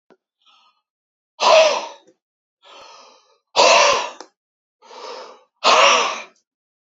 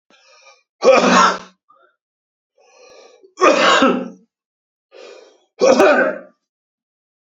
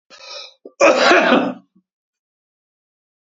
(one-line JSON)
{"exhalation_length": "7.0 s", "exhalation_amplitude": 30038, "exhalation_signal_mean_std_ratio": 0.38, "three_cough_length": "7.3 s", "three_cough_amplitude": 32667, "three_cough_signal_mean_std_ratio": 0.41, "cough_length": "3.3 s", "cough_amplitude": 31750, "cough_signal_mean_std_ratio": 0.39, "survey_phase": "beta (2021-08-13 to 2022-03-07)", "age": "65+", "gender": "Male", "wearing_mask": "No", "symptom_cough_any": true, "symptom_runny_or_blocked_nose": true, "symptom_onset": "8 days", "smoker_status": "Never smoked", "respiratory_condition_asthma": false, "respiratory_condition_other": false, "recruitment_source": "REACT", "submission_delay": "6 days", "covid_test_result": "Negative", "covid_test_method": "RT-qPCR", "influenza_a_test_result": "Negative", "influenza_b_test_result": "Negative"}